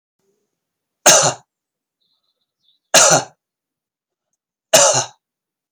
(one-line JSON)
{"three_cough_length": "5.7 s", "three_cough_amplitude": 32768, "three_cough_signal_mean_std_ratio": 0.3, "survey_phase": "beta (2021-08-13 to 2022-03-07)", "age": "45-64", "gender": "Male", "wearing_mask": "No", "symptom_fatigue": true, "symptom_onset": "12 days", "smoker_status": "Never smoked", "respiratory_condition_asthma": false, "respiratory_condition_other": false, "recruitment_source": "REACT", "submission_delay": "2 days", "covid_test_result": "Negative", "covid_test_method": "RT-qPCR", "influenza_a_test_result": "Negative", "influenza_b_test_result": "Negative"}